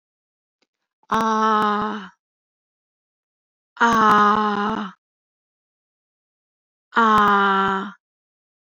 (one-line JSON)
{"exhalation_length": "8.6 s", "exhalation_amplitude": 23718, "exhalation_signal_mean_std_ratio": 0.46, "survey_phase": "alpha (2021-03-01 to 2021-08-12)", "age": "45-64", "gender": "Female", "wearing_mask": "No", "symptom_none": true, "smoker_status": "Never smoked", "respiratory_condition_asthma": false, "respiratory_condition_other": false, "recruitment_source": "REACT", "submission_delay": "4 days", "covid_test_result": "Negative", "covid_test_method": "RT-qPCR"}